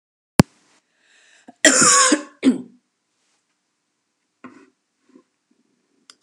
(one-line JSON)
{"cough_length": "6.2 s", "cough_amplitude": 32768, "cough_signal_mean_std_ratio": 0.26, "survey_phase": "beta (2021-08-13 to 2022-03-07)", "age": "45-64", "gender": "Female", "wearing_mask": "No", "symptom_runny_or_blocked_nose": true, "symptom_fatigue": true, "symptom_headache": true, "smoker_status": "Never smoked", "respiratory_condition_asthma": false, "respiratory_condition_other": false, "recruitment_source": "Test and Trace", "submission_delay": "2 days", "covid_test_result": "Positive", "covid_test_method": "RT-qPCR"}